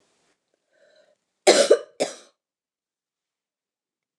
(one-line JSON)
{"cough_length": "4.2 s", "cough_amplitude": 25728, "cough_signal_mean_std_ratio": 0.22, "survey_phase": "beta (2021-08-13 to 2022-03-07)", "age": "65+", "gender": "Female", "wearing_mask": "No", "symptom_cough_any": true, "symptom_runny_or_blocked_nose": true, "symptom_fatigue": true, "symptom_headache": true, "symptom_loss_of_taste": true, "symptom_onset": "4 days", "smoker_status": "Never smoked", "respiratory_condition_asthma": false, "respiratory_condition_other": false, "recruitment_source": "Test and Trace", "submission_delay": "2 days", "covid_test_result": "Positive", "covid_test_method": "RT-qPCR", "covid_ct_value": 20.3, "covid_ct_gene": "ORF1ab gene", "covid_ct_mean": 20.4, "covid_viral_load": "210000 copies/ml", "covid_viral_load_category": "Low viral load (10K-1M copies/ml)"}